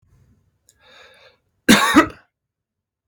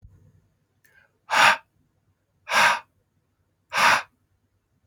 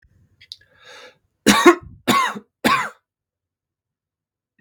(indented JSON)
{
  "cough_length": "3.1 s",
  "cough_amplitude": 32768,
  "cough_signal_mean_std_ratio": 0.27,
  "exhalation_length": "4.9 s",
  "exhalation_amplitude": 23499,
  "exhalation_signal_mean_std_ratio": 0.32,
  "three_cough_length": "4.6 s",
  "three_cough_amplitude": 32768,
  "three_cough_signal_mean_std_ratio": 0.31,
  "survey_phase": "beta (2021-08-13 to 2022-03-07)",
  "age": "45-64",
  "gender": "Male",
  "wearing_mask": "No",
  "symptom_none": true,
  "smoker_status": "Ex-smoker",
  "respiratory_condition_asthma": false,
  "respiratory_condition_other": false,
  "recruitment_source": "REACT",
  "submission_delay": "2 days",
  "covid_test_result": "Negative",
  "covid_test_method": "RT-qPCR",
  "influenza_a_test_result": "Negative",
  "influenza_b_test_result": "Negative"
}